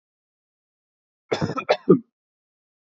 {"cough_length": "3.0 s", "cough_amplitude": 25738, "cough_signal_mean_std_ratio": 0.24, "survey_phase": "beta (2021-08-13 to 2022-03-07)", "age": "18-44", "gender": "Male", "wearing_mask": "No", "symptom_none": true, "symptom_onset": "7 days", "smoker_status": "Never smoked", "respiratory_condition_asthma": false, "respiratory_condition_other": false, "recruitment_source": "REACT", "submission_delay": "2 days", "covid_test_result": "Negative", "covid_test_method": "RT-qPCR"}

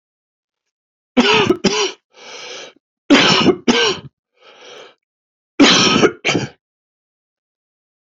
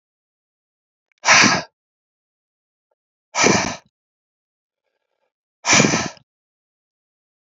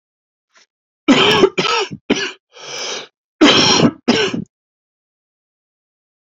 {"three_cough_length": "8.1 s", "three_cough_amplitude": 30877, "three_cough_signal_mean_std_ratio": 0.42, "exhalation_length": "7.6 s", "exhalation_amplitude": 31513, "exhalation_signal_mean_std_ratio": 0.29, "cough_length": "6.2 s", "cough_amplitude": 31612, "cough_signal_mean_std_ratio": 0.44, "survey_phase": "beta (2021-08-13 to 2022-03-07)", "age": "18-44", "gender": "Male", "wearing_mask": "No", "symptom_cough_any": true, "symptom_runny_or_blocked_nose": true, "symptom_onset": "4 days", "smoker_status": "Never smoked", "respiratory_condition_asthma": false, "respiratory_condition_other": false, "recruitment_source": "Test and Trace", "submission_delay": "2 days", "covid_test_result": "Negative", "covid_test_method": "RT-qPCR"}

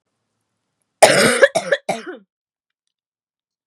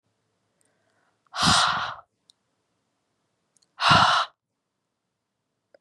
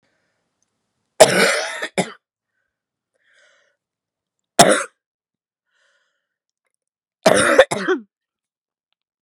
{"cough_length": "3.7 s", "cough_amplitude": 32768, "cough_signal_mean_std_ratio": 0.31, "exhalation_length": "5.8 s", "exhalation_amplitude": 21106, "exhalation_signal_mean_std_ratio": 0.32, "three_cough_length": "9.2 s", "three_cough_amplitude": 32768, "three_cough_signal_mean_std_ratio": 0.28, "survey_phase": "beta (2021-08-13 to 2022-03-07)", "age": "18-44", "gender": "Female", "wearing_mask": "No", "symptom_cough_any": true, "symptom_new_continuous_cough": true, "symptom_runny_or_blocked_nose": true, "symptom_sore_throat": true, "symptom_abdominal_pain": true, "symptom_diarrhoea": true, "symptom_fatigue": true, "symptom_headache": true, "symptom_change_to_sense_of_smell_or_taste": true, "smoker_status": "Current smoker (e-cigarettes or vapes only)", "respiratory_condition_asthma": true, "respiratory_condition_other": false, "recruitment_source": "Test and Trace", "submission_delay": "4 days", "covid_test_result": "Positive", "covid_test_method": "LFT"}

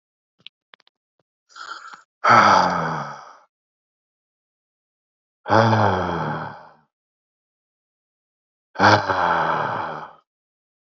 {"exhalation_length": "10.9 s", "exhalation_amplitude": 28598, "exhalation_signal_mean_std_ratio": 0.39, "survey_phase": "alpha (2021-03-01 to 2021-08-12)", "age": "18-44", "gender": "Male", "wearing_mask": "No", "symptom_cough_any": true, "symptom_fatigue": true, "symptom_fever_high_temperature": true, "symptom_headache": true, "symptom_loss_of_taste": true, "smoker_status": "Ex-smoker", "respiratory_condition_asthma": false, "respiratory_condition_other": false, "recruitment_source": "Test and Trace", "submission_delay": "1 day", "covid_test_result": "Positive", "covid_test_method": "RT-qPCR", "covid_ct_value": 32.5, "covid_ct_gene": "N gene"}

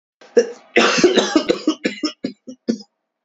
{"three_cough_length": "3.2 s", "three_cough_amplitude": 29150, "three_cough_signal_mean_std_ratio": 0.48, "survey_phase": "beta (2021-08-13 to 2022-03-07)", "age": "18-44", "gender": "Male", "wearing_mask": "No", "symptom_cough_any": true, "symptom_new_continuous_cough": true, "symptom_runny_or_blocked_nose": true, "symptom_shortness_of_breath": true, "symptom_sore_throat": true, "symptom_diarrhoea": true, "symptom_fatigue": true, "symptom_fever_high_temperature": true, "symptom_headache": true, "symptom_change_to_sense_of_smell_or_taste": true, "symptom_loss_of_taste": true, "symptom_onset": "2 days", "smoker_status": "Ex-smoker", "respiratory_condition_asthma": true, "respiratory_condition_other": false, "recruitment_source": "Test and Trace", "submission_delay": "2 days", "covid_test_result": "Positive", "covid_test_method": "RT-qPCR", "covid_ct_value": 16.8, "covid_ct_gene": "ORF1ab gene", "covid_ct_mean": 17.3, "covid_viral_load": "2200000 copies/ml", "covid_viral_load_category": "High viral load (>1M copies/ml)"}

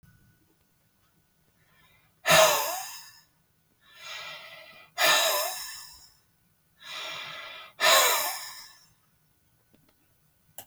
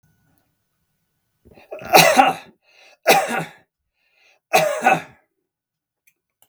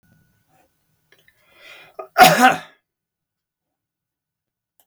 {"exhalation_length": "10.7 s", "exhalation_amplitude": 15304, "exhalation_signal_mean_std_ratio": 0.36, "three_cough_length": "6.5 s", "three_cough_amplitude": 32768, "three_cough_signal_mean_std_ratio": 0.33, "cough_length": "4.9 s", "cough_amplitude": 32768, "cough_signal_mean_std_ratio": 0.22, "survey_phase": "beta (2021-08-13 to 2022-03-07)", "age": "65+", "gender": "Male", "wearing_mask": "No", "symptom_none": true, "smoker_status": "Never smoked", "respiratory_condition_asthma": false, "respiratory_condition_other": false, "recruitment_source": "REACT", "submission_delay": "2 days", "covid_test_result": "Negative", "covid_test_method": "RT-qPCR", "influenza_a_test_result": "Negative", "influenza_b_test_result": "Negative"}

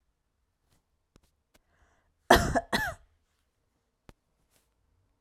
{"cough_length": "5.2 s", "cough_amplitude": 21560, "cough_signal_mean_std_ratio": 0.2, "survey_phase": "alpha (2021-03-01 to 2021-08-12)", "age": "45-64", "gender": "Female", "wearing_mask": "No", "symptom_shortness_of_breath": true, "symptom_abdominal_pain": true, "symptom_fatigue": true, "symptom_headache": true, "symptom_change_to_sense_of_smell_or_taste": true, "symptom_loss_of_taste": true, "symptom_onset": "3 days", "smoker_status": "Never smoked", "respiratory_condition_asthma": false, "respiratory_condition_other": false, "recruitment_source": "Test and Trace", "submission_delay": "2 days", "covid_test_result": "Positive", "covid_test_method": "RT-qPCR", "covid_ct_value": 38.4, "covid_ct_gene": "N gene"}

